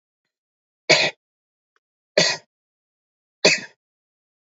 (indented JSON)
{
  "three_cough_length": "4.5 s",
  "three_cough_amplitude": 30353,
  "three_cough_signal_mean_std_ratio": 0.25,
  "survey_phase": "beta (2021-08-13 to 2022-03-07)",
  "age": "45-64",
  "gender": "Male",
  "wearing_mask": "No",
  "symptom_none": true,
  "smoker_status": "Never smoked",
  "respiratory_condition_asthma": false,
  "respiratory_condition_other": false,
  "recruitment_source": "REACT",
  "submission_delay": "3 days",
  "covid_test_result": "Negative",
  "covid_test_method": "RT-qPCR"
}